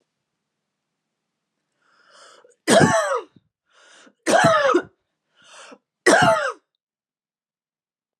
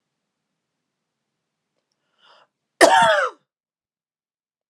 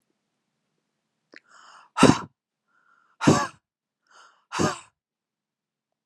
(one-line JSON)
{"three_cough_length": "8.2 s", "three_cough_amplitude": 29146, "three_cough_signal_mean_std_ratio": 0.35, "cough_length": "4.7 s", "cough_amplitude": 32767, "cough_signal_mean_std_ratio": 0.25, "exhalation_length": "6.1 s", "exhalation_amplitude": 28530, "exhalation_signal_mean_std_ratio": 0.23, "survey_phase": "beta (2021-08-13 to 2022-03-07)", "age": "18-44", "gender": "Female", "wearing_mask": "No", "symptom_none": true, "smoker_status": "Never smoked", "respiratory_condition_asthma": false, "respiratory_condition_other": false, "recruitment_source": "REACT", "submission_delay": "1 day", "covid_test_result": "Negative", "covid_test_method": "RT-qPCR", "influenza_a_test_result": "Negative", "influenza_b_test_result": "Negative"}